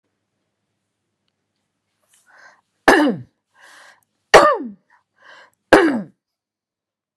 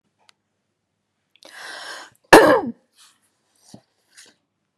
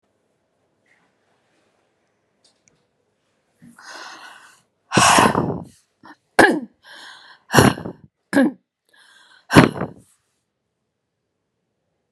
{
  "three_cough_length": "7.2 s",
  "three_cough_amplitude": 32768,
  "three_cough_signal_mean_std_ratio": 0.26,
  "cough_length": "4.8 s",
  "cough_amplitude": 32768,
  "cough_signal_mean_std_ratio": 0.21,
  "exhalation_length": "12.1 s",
  "exhalation_amplitude": 32768,
  "exhalation_signal_mean_std_ratio": 0.27,
  "survey_phase": "beta (2021-08-13 to 2022-03-07)",
  "age": "65+",
  "gender": "Female",
  "wearing_mask": "No",
  "symptom_cough_any": true,
  "smoker_status": "Never smoked",
  "respiratory_condition_asthma": false,
  "respiratory_condition_other": false,
  "recruitment_source": "Test and Trace",
  "submission_delay": "1 day",
  "covid_test_result": "Positive",
  "covid_test_method": "RT-qPCR",
  "covid_ct_value": 17.3,
  "covid_ct_gene": "ORF1ab gene",
  "covid_ct_mean": 17.9,
  "covid_viral_load": "1400000 copies/ml",
  "covid_viral_load_category": "High viral load (>1M copies/ml)"
}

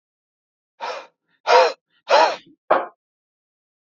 {
  "exhalation_length": "3.8 s",
  "exhalation_amplitude": 26594,
  "exhalation_signal_mean_std_ratio": 0.33,
  "survey_phase": "alpha (2021-03-01 to 2021-08-12)",
  "age": "45-64",
  "gender": "Male",
  "wearing_mask": "No",
  "symptom_none": true,
  "smoker_status": "Never smoked",
  "respiratory_condition_asthma": false,
  "respiratory_condition_other": false,
  "recruitment_source": "REACT",
  "submission_delay": "2 days",
  "covid_test_result": "Negative",
  "covid_test_method": "RT-qPCR"
}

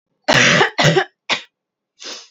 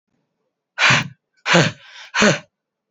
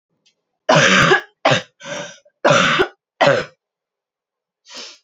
{
  "cough_length": "2.3 s",
  "cough_amplitude": 32768,
  "cough_signal_mean_std_ratio": 0.49,
  "exhalation_length": "2.9 s",
  "exhalation_amplitude": 29016,
  "exhalation_signal_mean_std_ratio": 0.41,
  "three_cough_length": "5.0 s",
  "three_cough_amplitude": 29691,
  "three_cough_signal_mean_std_ratio": 0.45,
  "survey_phase": "alpha (2021-03-01 to 2021-08-12)",
  "age": "18-44",
  "gender": "Female",
  "wearing_mask": "No",
  "symptom_headache": true,
  "symptom_onset": "3 days",
  "smoker_status": "Never smoked",
  "respiratory_condition_asthma": false,
  "respiratory_condition_other": false,
  "recruitment_source": "Test and Trace",
  "submission_delay": "2 days",
  "covid_test_result": "Positive",
  "covid_test_method": "RT-qPCR",
  "covid_ct_value": 15.3,
  "covid_ct_gene": "ORF1ab gene",
  "covid_ct_mean": 15.4,
  "covid_viral_load": "8800000 copies/ml",
  "covid_viral_load_category": "High viral load (>1M copies/ml)"
}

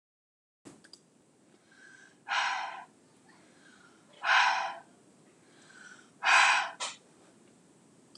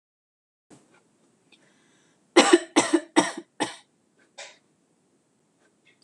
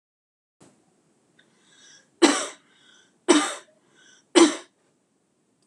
{
  "exhalation_length": "8.2 s",
  "exhalation_amplitude": 10379,
  "exhalation_signal_mean_std_ratio": 0.35,
  "cough_length": "6.0 s",
  "cough_amplitude": 25062,
  "cough_signal_mean_std_ratio": 0.24,
  "three_cough_length": "5.7 s",
  "three_cough_amplitude": 25562,
  "three_cough_signal_mean_std_ratio": 0.25,
  "survey_phase": "beta (2021-08-13 to 2022-03-07)",
  "age": "18-44",
  "gender": "Female",
  "wearing_mask": "No",
  "symptom_none": true,
  "smoker_status": "Ex-smoker",
  "respiratory_condition_asthma": false,
  "respiratory_condition_other": false,
  "recruitment_source": "REACT",
  "submission_delay": "1 day",
  "covid_test_result": "Negative",
  "covid_test_method": "RT-qPCR"
}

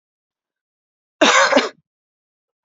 {
  "cough_length": "2.6 s",
  "cough_amplitude": 28460,
  "cough_signal_mean_std_ratio": 0.32,
  "survey_phase": "beta (2021-08-13 to 2022-03-07)",
  "age": "18-44",
  "gender": "Female",
  "wearing_mask": "No",
  "symptom_runny_or_blocked_nose": true,
  "symptom_sore_throat": true,
  "symptom_fatigue": true,
  "symptom_fever_high_temperature": true,
  "symptom_headache": true,
  "smoker_status": "Never smoked",
  "respiratory_condition_asthma": false,
  "respiratory_condition_other": false,
  "recruitment_source": "Test and Trace",
  "submission_delay": "-1 day",
  "covid_test_result": "Positive",
  "covid_test_method": "LFT"
}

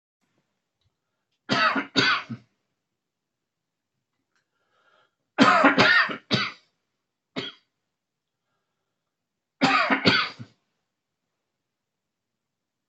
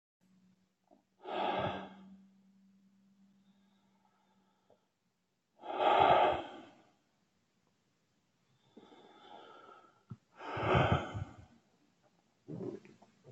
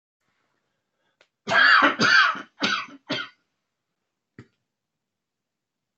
{
  "three_cough_length": "12.9 s",
  "three_cough_amplitude": 22805,
  "three_cough_signal_mean_std_ratio": 0.32,
  "exhalation_length": "13.3 s",
  "exhalation_amplitude": 6536,
  "exhalation_signal_mean_std_ratio": 0.32,
  "cough_length": "6.0 s",
  "cough_amplitude": 18662,
  "cough_signal_mean_std_ratio": 0.35,
  "survey_phase": "beta (2021-08-13 to 2022-03-07)",
  "age": "65+",
  "gender": "Male",
  "wearing_mask": "No",
  "symptom_cough_any": true,
  "symptom_shortness_of_breath": true,
  "smoker_status": "Never smoked",
  "respiratory_condition_asthma": false,
  "respiratory_condition_other": true,
  "recruitment_source": "REACT",
  "submission_delay": "1 day",
  "covid_test_result": "Negative",
  "covid_test_method": "RT-qPCR"
}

